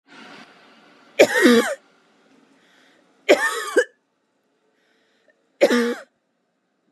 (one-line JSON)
{"three_cough_length": "6.9 s", "three_cough_amplitude": 32690, "three_cough_signal_mean_std_ratio": 0.33, "survey_phase": "beta (2021-08-13 to 2022-03-07)", "age": "18-44", "gender": "Female", "wearing_mask": "No", "symptom_none": true, "smoker_status": "Never smoked", "respiratory_condition_asthma": true, "respiratory_condition_other": false, "recruitment_source": "REACT", "submission_delay": "0 days", "covid_test_result": "Negative", "covid_test_method": "RT-qPCR"}